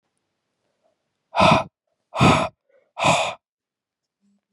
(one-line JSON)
{"exhalation_length": "4.5 s", "exhalation_amplitude": 25636, "exhalation_signal_mean_std_ratio": 0.35, "survey_phase": "beta (2021-08-13 to 2022-03-07)", "age": "18-44", "gender": "Female", "wearing_mask": "No", "symptom_cough_any": true, "symptom_runny_or_blocked_nose": true, "symptom_shortness_of_breath": true, "symptom_sore_throat": true, "symptom_abdominal_pain": true, "symptom_fatigue": true, "symptom_fever_high_temperature": true, "symptom_headache": true, "symptom_change_to_sense_of_smell_or_taste": true, "symptom_loss_of_taste": true, "symptom_other": true, "symptom_onset": "5 days", "smoker_status": "Ex-smoker", "respiratory_condition_asthma": false, "respiratory_condition_other": false, "recruitment_source": "Test and Trace", "submission_delay": "2 days", "covid_test_result": "Positive", "covid_test_method": "RT-qPCR", "covid_ct_value": 17.9, "covid_ct_gene": "ORF1ab gene", "covid_ct_mean": 18.2, "covid_viral_load": "1000000 copies/ml", "covid_viral_load_category": "High viral load (>1M copies/ml)"}